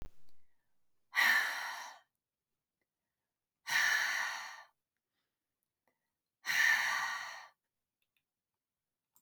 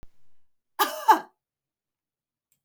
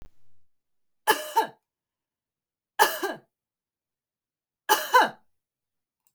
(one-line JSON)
{"exhalation_length": "9.2 s", "exhalation_amplitude": 4758, "exhalation_signal_mean_std_ratio": 0.41, "cough_length": "2.6 s", "cough_amplitude": 17712, "cough_signal_mean_std_ratio": 0.25, "three_cough_length": "6.1 s", "three_cough_amplitude": 21549, "three_cough_signal_mean_std_ratio": 0.28, "survey_phase": "beta (2021-08-13 to 2022-03-07)", "age": "45-64", "gender": "Female", "wearing_mask": "No", "symptom_none": true, "smoker_status": "Never smoked", "respiratory_condition_asthma": false, "respiratory_condition_other": false, "recruitment_source": "REACT", "submission_delay": "2 days", "covid_test_result": "Negative", "covid_test_method": "RT-qPCR", "influenza_a_test_result": "Negative", "influenza_b_test_result": "Negative"}